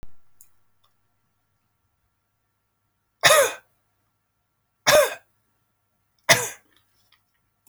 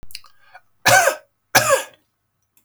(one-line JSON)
{"three_cough_length": "7.7 s", "three_cough_amplitude": 32767, "three_cough_signal_mean_std_ratio": 0.24, "cough_length": "2.6 s", "cough_amplitude": 32768, "cough_signal_mean_std_ratio": 0.38, "survey_phase": "beta (2021-08-13 to 2022-03-07)", "age": "65+", "gender": "Male", "wearing_mask": "No", "symptom_fatigue": true, "symptom_onset": "13 days", "smoker_status": "Never smoked", "respiratory_condition_asthma": false, "respiratory_condition_other": false, "recruitment_source": "REACT", "submission_delay": "4 days", "covid_test_result": "Negative", "covid_test_method": "RT-qPCR"}